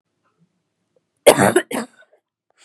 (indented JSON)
{
  "three_cough_length": "2.6 s",
  "three_cough_amplitude": 32768,
  "three_cough_signal_mean_std_ratio": 0.27,
  "survey_phase": "beta (2021-08-13 to 2022-03-07)",
  "age": "18-44",
  "gender": "Female",
  "wearing_mask": "No",
  "symptom_cough_any": true,
  "symptom_runny_or_blocked_nose": true,
  "symptom_sore_throat": true,
  "symptom_headache": true,
  "smoker_status": "Ex-smoker",
  "respiratory_condition_asthma": false,
  "respiratory_condition_other": false,
  "recruitment_source": "Test and Trace",
  "submission_delay": "1 day",
  "covid_test_result": "Positive",
  "covid_test_method": "LFT"
}